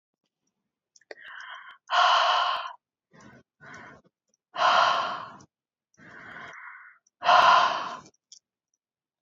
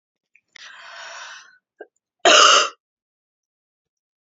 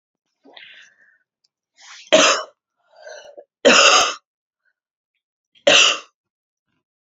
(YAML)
exhalation_length: 9.2 s
exhalation_amplitude: 17080
exhalation_signal_mean_std_ratio: 0.4
cough_length: 4.3 s
cough_amplitude: 32768
cough_signal_mean_std_ratio: 0.28
three_cough_length: 7.1 s
three_cough_amplitude: 32211
three_cough_signal_mean_std_ratio: 0.32
survey_phase: beta (2021-08-13 to 2022-03-07)
age: 18-44
gender: Female
wearing_mask: 'No'
symptom_cough_any: true
symptom_runny_or_blocked_nose: true
symptom_fatigue: true
symptom_onset: 3 days
smoker_status: Current smoker (e-cigarettes or vapes only)
respiratory_condition_asthma: false
respiratory_condition_other: false
recruitment_source: Test and Trace
submission_delay: 1 day
covid_test_result: Positive
covid_test_method: RT-qPCR
covid_ct_value: 21.6
covid_ct_gene: N gene